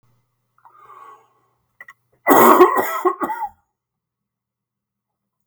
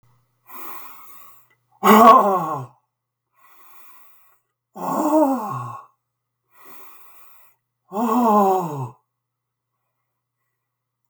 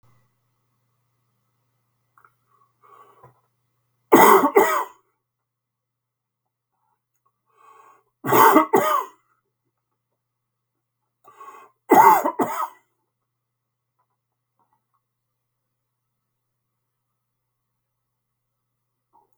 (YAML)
cough_length: 5.5 s
cough_amplitude: 32768
cough_signal_mean_std_ratio: 0.31
exhalation_length: 11.1 s
exhalation_amplitude: 32768
exhalation_signal_mean_std_ratio: 0.35
three_cough_length: 19.4 s
three_cough_amplitude: 32768
three_cough_signal_mean_std_ratio: 0.24
survey_phase: beta (2021-08-13 to 2022-03-07)
age: 65+
gender: Male
wearing_mask: 'No'
symptom_none: true
smoker_status: Never smoked
respiratory_condition_asthma: false
respiratory_condition_other: false
recruitment_source: REACT
submission_delay: 3 days
covid_test_result: Negative
covid_test_method: RT-qPCR
influenza_a_test_result: Negative
influenza_b_test_result: Negative